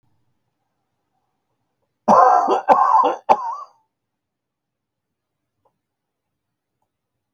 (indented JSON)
{
  "cough_length": "7.3 s",
  "cough_amplitude": 28774,
  "cough_signal_mean_std_ratio": 0.31,
  "survey_phase": "beta (2021-08-13 to 2022-03-07)",
  "age": "65+",
  "gender": "Male",
  "wearing_mask": "No",
  "symptom_fatigue": true,
  "smoker_status": "Never smoked",
  "respiratory_condition_asthma": false,
  "respiratory_condition_other": false,
  "recruitment_source": "REACT",
  "submission_delay": "2 days",
  "covid_test_result": "Negative",
  "covid_test_method": "RT-qPCR"
}